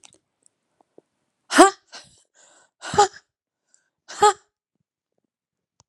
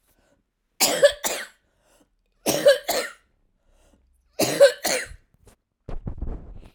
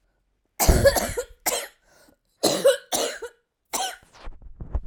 {"exhalation_length": "5.9 s", "exhalation_amplitude": 32767, "exhalation_signal_mean_std_ratio": 0.2, "three_cough_length": "6.7 s", "three_cough_amplitude": 24667, "three_cough_signal_mean_std_ratio": 0.36, "cough_length": "4.9 s", "cough_amplitude": 27487, "cough_signal_mean_std_ratio": 0.44, "survey_phase": "alpha (2021-03-01 to 2021-08-12)", "age": "45-64", "gender": "Female", "wearing_mask": "No", "symptom_cough_any": true, "symptom_fatigue": true, "symptom_change_to_sense_of_smell_or_taste": true, "symptom_onset": "3 days", "smoker_status": "Never smoked", "respiratory_condition_asthma": true, "respiratory_condition_other": false, "recruitment_source": "Test and Trace", "submission_delay": "2 days", "covid_test_result": "Positive", "covid_test_method": "RT-qPCR"}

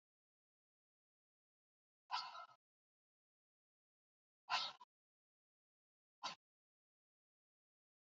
{"exhalation_length": "8.0 s", "exhalation_amplitude": 1533, "exhalation_signal_mean_std_ratio": 0.2, "survey_phase": "alpha (2021-03-01 to 2021-08-12)", "age": "45-64", "gender": "Female", "wearing_mask": "No", "symptom_none": true, "smoker_status": "Ex-smoker", "respiratory_condition_asthma": false, "respiratory_condition_other": false, "recruitment_source": "REACT", "submission_delay": "10 days", "covid_test_result": "Negative", "covid_test_method": "RT-qPCR"}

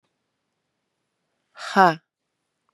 {"exhalation_length": "2.7 s", "exhalation_amplitude": 30697, "exhalation_signal_mean_std_ratio": 0.19, "survey_phase": "beta (2021-08-13 to 2022-03-07)", "age": "45-64", "gender": "Female", "wearing_mask": "Yes", "symptom_runny_or_blocked_nose": true, "symptom_sore_throat": true, "symptom_change_to_sense_of_smell_or_taste": true, "symptom_loss_of_taste": true, "symptom_onset": "2 days", "smoker_status": "Never smoked", "respiratory_condition_asthma": false, "respiratory_condition_other": false, "recruitment_source": "Test and Trace", "submission_delay": "1 day", "covid_test_result": "Positive", "covid_test_method": "RT-qPCR", "covid_ct_value": 15.3, "covid_ct_gene": "ORF1ab gene", "covid_ct_mean": 15.7, "covid_viral_load": "6900000 copies/ml", "covid_viral_load_category": "High viral load (>1M copies/ml)"}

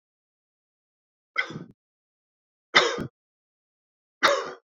{"three_cough_length": "4.7 s", "three_cough_amplitude": 23561, "three_cough_signal_mean_std_ratio": 0.26, "survey_phase": "beta (2021-08-13 to 2022-03-07)", "age": "45-64", "gender": "Male", "wearing_mask": "No", "symptom_runny_or_blocked_nose": true, "symptom_fatigue": true, "symptom_headache": true, "symptom_change_to_sense_of_smell_or_taste": true, "symptom_onset": "3 days", "smoker_status": "Never smoked", "respiratory_condition_asthma": true, "respiratory_condition_other": false, "recruitment_source": "Test and Trace", "submission_delay": "2 days", "covid_test_result": "Positive", "covid_test_method": "ePCR"}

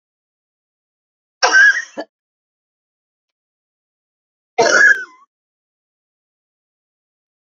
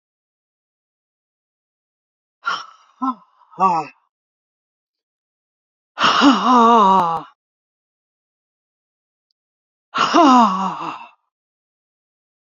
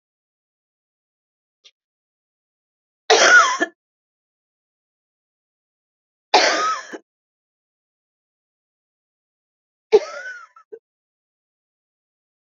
{"cough_length": "7.4 s", "cough_amplitude": 31035, "cough_signal_mean_std_ratio": 0.27, "exhalation_length": "12.5 s", "exhalation_amplitude": 32767, "exhalation_signal_mean_std_ratio": 0.35, "three_cough_length": "12.5 s", "three_cough_amplitude": 31166, "three_cough_signal_mean_std_ratio": 0.23, "survey_phase": "beta (2021-08-13 to 2022-03-07)", "age": "65+", "gender": "Female", "wearing_mask": "No", "symptom_none": true, "smoker_status": "Current smoker (e-cigarettes or vapes only)", "respiratory_condition_asthma": false, "respiratory_condition_other": false, "recruitment_source": "REACT", "submission_delay": "1 day", "covid_test_result": "Negative", "covid_test_method": "RT-qPCR", "influenza_a_test_result": "Unknown/Void", "influenza_b_test_result": "Unknown/Void"}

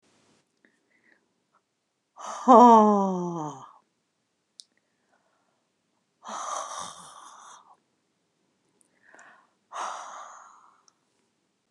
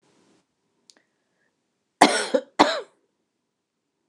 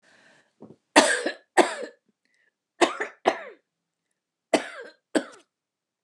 {"exhalation_length": "11.7 s", "exhalation_amplitude": 24816, "exhalation_signal_mean_std_ratio": 0.23, "cough_length": "4.1 s", "cough_amplitude": 29204, "cough_signal_mean_std_ratio": 0.23, "three_cough_length": "6.0 s", "three_cough_amplitude": 28644, "three_cough_signal_mean_std_ratio": 0.28, "survey_phase": "beta (2021-08-13 to 2022-03-07)", "age": "65+", "gender": "Female", "wearing_mask": "No", "symptom_none": true, "smoker_status": "Never smoked", "respiratory_condition_asthma": false, "respiratory_condition_other": false, "recruitment_source": "REACT", "submission_delay": "2 days", "covid_test_result": "Negative", "covid_test_method": "RT-qPCR", "influenza_a_test_result": "Unknown/Void", "influenza_b_test_result": "Unknown/Void"}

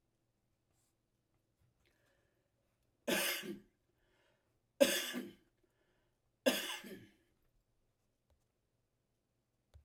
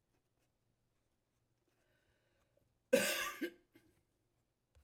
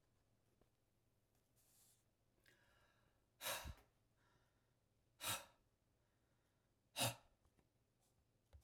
{"three_cough_length": "9.8 s", "three_cough_amplitude": 6910, "three_cough_signal_mean_std_ratio": 0.24, "cough_length": "4.8 s", "cough_amplitude": 4145, "cough_signal_mean_std_ratio": 0.23, "exhalation_length": "8.6 s", "exhalation_amplitude": 1346, "exhalation_signal_mean_std_ratio": 0.25, "survey_phase": "alpha (2021-03-01 to 2021-08-12)", "age": "65+", "gender": "Male", "wearing_mask": "No", "symptom_none": true, "smoker_status": "Never smoked", "respiratory_condition_asthma": false, "respiratory_condition_other": false, "recruitment_source": "REACT", "submission_delay": "16 days", "covid_test_result": "Negative", "covid_test_method": "RT-qPCR"}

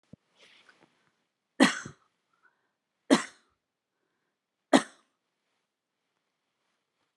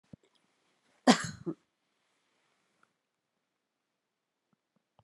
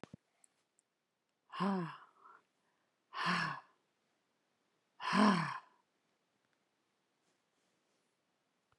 {"three_cough_length": "7.2 s", "three_cough_amplitude": 19995, "three_cough_signal_mean_std_ratio": 0.16, "cough_length": "5.0 s", "cough_amplitude": 14031, "cough_signal_mean_std_ratio": 0.14, "exhalation_length": "8.8 s", "exhalation_amplitude": 5509, "exhalation_signal_mean_std_ratio": 0.29, "survey_phase": "alpha (2021-03-01 to 2021-08-12)", "age": "65+", "gender": "Female", "wearing_mask": "No", "symptom_cough_any": true, "smoker_status": "Never smoked", "respiratory_condition_asthma": false, "respiratory_condition_other": false, "recruitment_source": "REACT", "submission_delay": "2 days", "covid_test_result": "Negative", "covid_test_method": "RT-qPCR"}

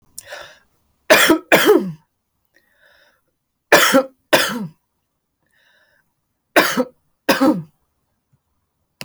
{"three_cough_length": "9.0 s", "three_cough_amplitude": 31770, "three_cough_signal_mean_std_ratio": 0.35, "survey_phase": "alpha (2021-03-01 to 2021-08-12)", "age": "18-44", "gender": "Female", "wearing_mask": "No", "symptom_fatigue": true, "symptom_fever_high_temperature": true, "symptom_headache": true, "smoker_status": "Never smoked", "respiratory_condition_asthma": false, "respiratory_condition_other": false, "recruitment_source": "Test and Trace", "submission_delay": "1 day", "covid_test_result": "Positive", "covid_test_method": "RT-qPCR", "covid_ct_value": 28.2, "covid_ct_gene": "ORF1ab gene", "covid_ct_mean": 29.0, "covid_viral_load": "300 copies/ml", "covid_viral_load_category": "Minimal viral load (< 10K copies/ml)"}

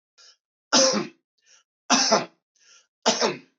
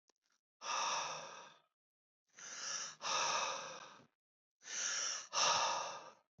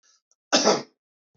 {"three_cough_length": "3.6 s", "three_cough_amplitude": 17020, "three_cough_signal_mean_std_ratio": 0.41, "exhalation_length": "6.4 s", "exhalation_amplitude": 3008, "exhalation_signal_mean_std_ratio": 0.59, "cough_length": "1.4 s", "cough_amplitude": 19472, "cough_signal_mean_std_ratio": 0.35, "survey_phase": "beta (2021-08-13 to 2022-03-07)", "age": "18-44", "gender": "Male", "wearing_mask": "No", "symptom_cough_any": true, "symptom_sore_throat": true, "smoker_status": "Never smoked", "respiratory_condition_asthma": false, "respiratory_condition_other": false, "recruitment_source": "REACT", "submission_delay": "0 days", "covid_test_result": "Negative", "covid_test_method": "RT-qPCR"}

